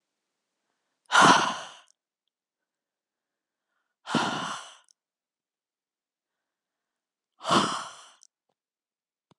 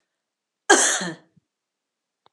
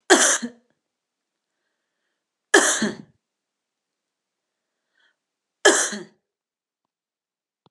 {"exhalation_length": "9.4 s", "exhalation_amplitude": 17098, "exhalation_signal_mean_std_ratio": 0.25, "cough_length": "2.3 s", "cough_amplitude": 31698, "cough_signal_mean_std_ratio": 0.29, "three_cough_length": "7.7 s", "three_cough_amplitude": 32688, "three_cough_signal_mean_std_ratio": 0.26, "survey_phase": "alpha (2021-03-01 to 2021-08-12)", "age": "45-64", "gender": "Female", "wearing_mask": "No", "symptom_shortness_of_breath": true, "symptom_diarrhoea": true, "symptom_fever_high_temperature": true, "symptom_headache": true, "symptom_change_to_sense_of_smell_or_taste": true, "smoker_status": "Never smoked", "respiratory_condition_asthma": false, "respiratory_condition_other": false, "recruitment_source": "Test and Trace", "submission_delay": "2 days", "covid_test_result": "Positive", "covid_test_method": "RT-qPCR", "covid_ct_value": 17.8, "covid_ct_gene": "N gene", "covid_ct_mean": 18.0, "covid_viral_load": "1300000 copies/ml", "covid_viral_load_category": "High viral load (>1M copies/ml)"}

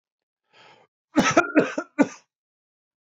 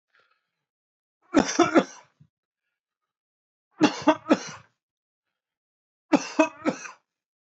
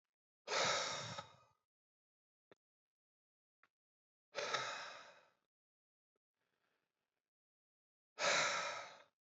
{"cough_length": "3.2 s", "cough_amplitude": 20034, "cough_signal_mean_std_ratio": 0.31, "three_cough_length": "7.4 s", "three_cough_amplitude": 19275, "three_cough_signal_mean_std_ratio": 0.27, "exhalation_length": "9.2 s", "exhalation_amplitude": 2293, "exhalation_signal_mean_std_ratio": 0.35, "survey_phase": "beta (2021-08-13 to 2022-03-07)", "age": "45-64", "gender": "Male", "wearing_mask": "No", "symptom_none": true, "smoker_status": "Never smoked", "respiratory_condition_asthma": false, "respiratory_condition_other": false, "recruitment_source": "REACT", "submission_delay": "1 day", "covid_test_result": "Negative", "covid_test_method": "RT-qPCR", "influenza_a_test_result": "Negative", "influenza_b_test_result": "Negative"}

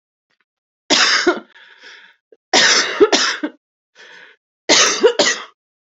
{"three_cough_length": "5.8 s", "three_cough_amplitude": 32768, "three_cough_signal_mean_std_ratio": 0.47, "survey_phase": "beta (2021-08-13 to 2022-03-07)", "age": "18-44", "gender": "Female", "wearing_mask": "No", "symptom_cough_any": true, "symptom_new_continuous_cough": true, "symptom_runny_or_blocked_nose": true, "symptom_shortness_of_breath": true, "symptom_sore_throat": true, "symptom_fatigue": true, "symptom_headache": true, "symptom_change_to_sense_of_smell_or_taste": true, "smoker_status": "Current smoker (11 or more cigarettes per day)", "respiratory_condition_asthma": false, "respiratory_condition_other": false, "recruitment_source": "Test and Trace", "submission_delay": "1 day", "covid_test_result": "Positive", "covid_test_method": "RT-qPCR", "covid_ct_value": 23.0, "covid_ct_gene": "N gene"}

